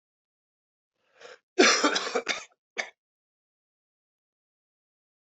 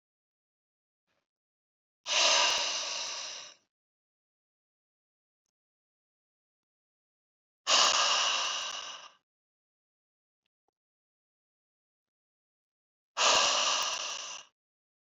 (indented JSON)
{
  "cough_length": "5.3 s",
  "cough_amplitude": 15308,
  "cough_signal_mean_std_ratio": 0.26,
  "exhalation_length": "15.1 s",
  "exhalation_amplitude": 8738,
  "exhalation_signal_mean_std_ratio": 0.37,
  "survey_phase": "beta (2021-08-13 to 2022-03-07)",
  "age": "45-64",
  "gender": "Male",
  "wearing_mask": "No",
  "symptom_cough_any": true,
  "symptom_runny_or_blocked_nose": true,
  "symptom_fever_high_temperature": true,
  "symptom_headache": true,
  "symptom_onset": "3 days",
  "smoker_status": "Never smoked",
  "respiratory_condition_asthma": false,
  "respiratory_condition_other": false,
  "recruitment_source": "Test and Trace",
  "submission_delay": "2 days",
  "covid_test_result": "Positive",
  "covid_test_method": "RT-qPCR",
  "covid_ct_value": 16.9,
  "covid_ct_gene": "ORF1ab gene",
  "covid_ct_mean": 18.5,
  "covid_viral_load": "870000 copies/ml",
  "covid_viral_load_category": "Low viral load (10K-1M copies/ml)"
}